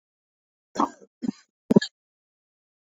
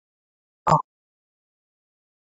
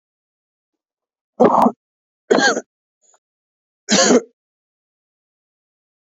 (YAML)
cough_length: 2.8 s
cough_amplitude: 25868
cough_signal_mean_std_ratio: 0.18
exhalation_length: 2.3 s
exhalation_amplitude: 19317
exhalation_signal_mean_std_ratio: 0.17
three_cough_length: 6.1 s
three_cough_amplitude: 31401
three_cough_signal_mean_std_ratio: 0.3
survey_phase: beta (2021-08-13 to 2022-03-07)
age: 18-44
gender: Male
wearing_mask: 'No'
symptom_none: true
smoker_status: Ex-smoker
respiratory_condition_asthma: true
respiratory_condition_other: false
recruitment_source: REACT
submission_delay: 2 days
covid_test_result: Negative
covid_test_method: RT-qPCR
covid_ct_value: 38.0
covid_ct_gene: N gene
influenza_a_test_result: Negative
influenza_b_test_result: Negative